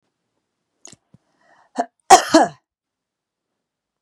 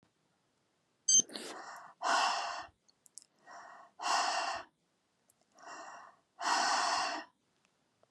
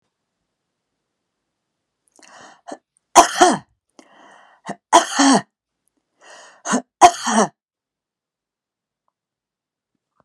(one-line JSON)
{"cough_length": "4.0 s", "cough_amplitude": 32768, "cough_signal_mean_std_ratio": 0.2, "exhalation_length": "8.1 s", "exhalation_amplitude": 4967, "exhalation_signal_mean_std_ratio": 0.45, "three_cough_length": "10.2 s", "three_cough_amplitude": 32768, "three_cough_signal_mean_std_ratio": 0.25, "survey_phase": "beta (2021-08-13 to 2022-03-07)", "age": "45-64", "gender": "Female", "wearing_mask": "No", "symptom_none": true, "smoker_status": "Never smoked", "respiratory_condition_asthma": false, "respiratory_condition_other": false, "recruitment_source": "REACT", "submission_delay": "1 day", "covid_test_result": "Negative", "covid_test_method": "RT-qPCR", "influenza_a_test_result": "Negative", "influenza_b_test_result": "Negative"}